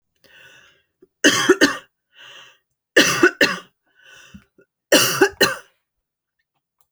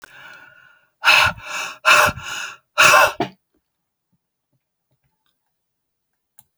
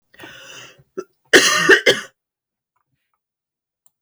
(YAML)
three_cough_length: 6.9 s
three_cough_amplitude: 30937
three_cough_signal_mean_std_ratio: 0.34
exhalation_length: 6.6 s
exhalation_amplitude: 31595
exhalation_signal_mean_std_ratio: 0.34
cough_length: 4.0 s
cough_amplitude: 32767
cough_signal_mean_std_ratio: 0.3
survey_phase: beta (2021-08-13 to 2022-03-07)
age: 45-64
gender: Female
wearing_mask: 'No'
symptom_none: true
smoker_status: Never smoked
respiratory_condition_asthma: false
respiratory_condition_other: false
recruitment_source: REACT
submission_delay: 3 days
covid_test_result: Negative
covid_test_method: RT-qPCR